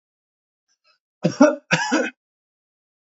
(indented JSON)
{
  "cough_length": "3.1 s",
  "cough_amplitude": 27655,
  "cough_signal_mean_std_ratio": 0.31,
  "survey_phase": "alpha (2021-03-01 to 2021-08-12)",
  "age": "45-64",
  "gender": "Male",
  "wearing_mask": "No",
  "symptom_none": true,
  "smoker_status": "Ex-smoker",
  "respiratory_condition_asthma": false,
  "respiratory_condition_other": false,
  "recruitment_source": "REACT",
  "submission_delay": "1 day",
  "covid_test_result": "Negative",
  "covid_test_method": "RT-qPCR"
}